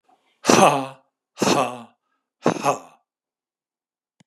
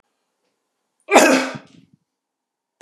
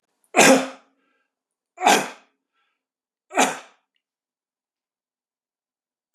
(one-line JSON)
{"exhalation_length": "4.3 s", "exhalation_amplitude": 32418, "exhalation_signal_mean_std_ratio": 0.34, "cough_length": "2.8 s", "cough_amplitude": 32768, "cough_signal_mean_std_ratio": 0.28, "three_cough_length": "6.1 s", "three_cough_amplitude": 31117, "three_cough_signal_mean_std_ratio": 0.26, "survey_phase": "beta (2021-08-13 to 2022-03-07)", "age": "65+", "gender": "Male", "wearing_mask": "No", "symptom_none": true, "symptom_onset": "5 days", "smoker_status": "Ex-smoker", "respiratory_condition_asthma": false, "respiratory_condition_other": false, "recruitment_source": "REACT", "submission_delay": "3 days", "covid_test_result": "Negative", "covid_test_method": "RT-qPCR", "influenza_a_test_result": "Negative", "influenza_b_test_result": "Negative"}